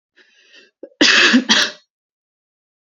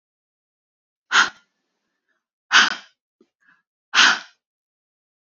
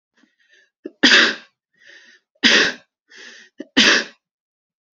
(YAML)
cough_length: 2.8 s
cough_amplitude: 32767
cough_signal_mean_std_ratio: 0.4
exhalation_length: 5.3 s
exhalation_amplitude: 31637
exhalation_signal_mean_std_ratio: 0.26
three_cough_length: 4.9 s
three_cough_amplitude: 31332
three_cough_signal_mean_std_ratio: 0.35
survey_phase: beta (2021-08-13 to 2022-03-07)
age: 18-44
gender: Female
wearing_mask: 'No'
symptom_none: true
smoker_status: Never smoked
respiratory_condition_asthma: false
respiratory_condition_other: false
recruitment_source: REACT
submission_delay: 1 day
covid_test_result: Negative
covid_test_method: RT-qPCR